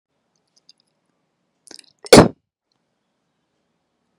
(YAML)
cough_length: 4.2 s
cough_amplitude: 32768
cough_signal_mean_std_ratio: 0.15
survey_phase: beta (2021-08-13 to 2022-03-07)
age: 18-44
gender: Female
wearing_mask: 'No'
symptom_fatigue: true
symptom_onset: 12 days
smoker_status: Current smoker (1 to 10 cigarettes per day)
respiratory_condition_asthma: false
respiratory_condition_other: false
recruitment_source: REACT
submission_delay: 3 days
covid_test_result: Negative
covid_test_method: RT-qPCR
influenza_a_test_result: Negative
influenza_b_test_result: Negative